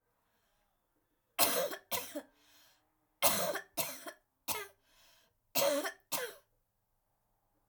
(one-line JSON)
{"cough_length": "7.7 s", "cough_amplitude": 7434, "cough_signal_mean_std_ratio": 0.38, "survey_phase": "alpha (2021-03-01 to 2021-08-12)", "age": "45-64", "gender": "Female", "wearing_mask": "No", "symptom_fatigue": true, "symptom_headache": true, "smoker_status": "Never smoked", "respiratory_condition_asthma": false, "respiratory_condition_other": false, "recruitment_source": "REACT", "submission_delay": "2 days", "covid_test_result": "Negative", "covid_test_method": "RT-qPCR"}